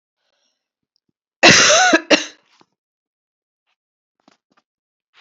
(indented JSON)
{
  "cough_length": "5.2 s",
  "cough_amplitude": 32768,
  "cough_signal_mean_std_ratio": 0.29,
  "survey_phase": "beta (2021-08-13 to 2022-03-07)",
  "age": "45-64",
  "gender": "Female",
  "wearing_mask": "No",
  "symptom_cough_any": true,
  "symptom_shortness_of_breath": true,
  "symptom_fatigue": true,
  "symptom_headache": true,
  "symptom_change_to_sense_of_smell_or_taste": true,
  "symptom_onset": "3 days",
  "smoker_status": "Ex-smoker",
  "respiratory_condition_asthma": false,
  "respiratory_condition_other": false,
  "recruitment_source": "Test and Trace",
  "submission_delay": "2 days",
  "covid_test_result": "Positive",
  "covid_test_method": "RT-qPCR",
  "covid_ct_value": 18.9,
  "covid_ct_gene": "ORF1ab gene",
  "covid_ct_mean": 19.4,
  "covid_viral_load": "440000 copies/ml",
  "covid_viral_load_category": "Low viral load (10K-1M copies/ml)"
}